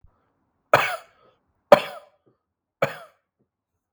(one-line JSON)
{"three_cough_length": "3.9 s", "three_cough_amplitude": 32768, "three_cough_signal_mean_std_ratio": 0.19, "survey_phase": "beta (2021-08-13 to 2022-03-07)", "age": "18-44", "gender": "Male", "wearing_mask": "No", "symptom_cough_any": true, "symptom_runny_or_blocked_nose": true, "symptom_fatigue": true, "symptom_onset": "2 days", "smoker_status": "Never smoked", "respiratory_condition_asthma": false, "respiratory_condition_other": false, "recruitment_source": "REACT", "submission_delay": "1 day", "covid_test_result": "Negative", "covid_test_method": "RT-qPCR"}